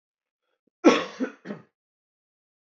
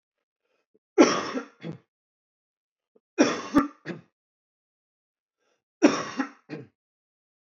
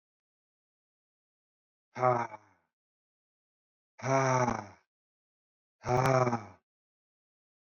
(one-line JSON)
{"cough_length": "2.6 s", "cough_amplitude": 19240, "cough_signal_mean_std_ratio": 0.24, "three_cough_length": "7.6 s", "three_cough_amplitude": 23027, "three_cough_signal_mean_std_ratio": 0.27, "exhalation_length": "7.8 s", "exhalation_amplitude": 7011, "exhalation_signal_mean_std_ratio": 0.33, "survey_phase": "beta (2021-08-13 to 2022-03-07)", "age": "18-44", "gender": "Male", "wearing_mask": "No", "symptom_cough_any": true, "symptom_sore_throat": true, "smoker_status": "Never smoked", "respiratory_condition_asthma": true, "respiratory_condition_other": false, "recruitment_source": "REACT", "submission_delay": "15 days", "covid_test_result": "Negative", "covid_test_method": "RT-qPCR", "influenza_a_test_result": "Unknown/Void", "influenza_b_test_result": "Unknown/Void"}